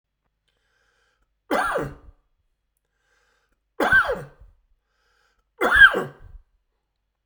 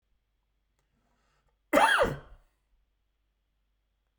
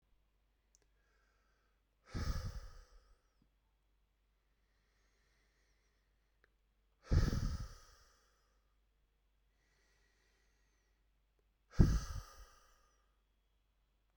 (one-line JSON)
{"three_cough_length": "7.3 s", "three_cough_amplitude": 31076, "three_cough_signal_mean_std_ratio": 0.28, "cough_length": "4.2 s", "cough_amplitude": 11922, "cough_signal_mean_std_ratio": 0.26, "exhalation_length": "14.2 s", "exhalation_amplitude": 6666, "exhalation_signal_mean_std_ratio": 0.22, "survey_phase": "beta (2021-08-13 to 2022-03-07)", "age": "45-64", "gender": "Male", "wearing_mask": "No", "symptom_cough_any": true, "symptom_change_to_sense_of_smell_or_taste": true, "symptom_onset": "7 days", "smoker_status": "Never smoked", "respiratory_condition_asthma": false, "respiratory_condition_other": false, "recruitment_source": "Test and Trace", "submission_delay": "1 day", "covid_test_result": "Positive", "covid_test_method": "RT-qPCR", "covid_ct_value": 17.3, "covid_ct_gene": "ORF1ab gene", "covid_ct_mean": 17.8, "covid_viral_load": "1500000 copies/ml", "covid_viral_load_category": "High viral load (>1M copies/ml)"}